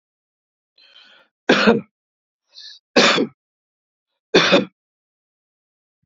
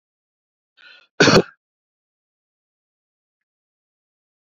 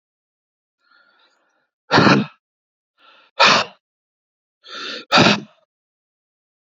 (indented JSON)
{
  "three_cough_length": "6.1 s",
  "three_cough_amplitude": 32767,
  "three_cough_signal_mean_std_ratio": 0.31,
  "cough_length": "4.4 s",
  "cough_amplitude": 31687,
  "cough_signal_mean_std_ratio": 0.18,
  "exhalation_length": "6.7 s",
  "exhalation_amplitude": 30093,
  "exhalation_signal_mean_std_ratio": 0.3,
  "survey_phase": "beta (2021-08-13 to 2022-03-07)",
  "age": "65+",
  "gender": "Male",
  "wearing_mask": "No",
  "symptom_none": true,
  "smoker_status": "Never smoked",
  "respiratory_condition_asthma": false,
  "respiratory_condition_other": false,
  "recruitment_source": "REACT",
  "submission_delay": "3 days",
  "covid_test_result": "Negative",
  "covid_test_method": "RT-qPCR",
  "influenza_a_test_result": "Negative",
  "influenza_b_test_result": "Negative"
}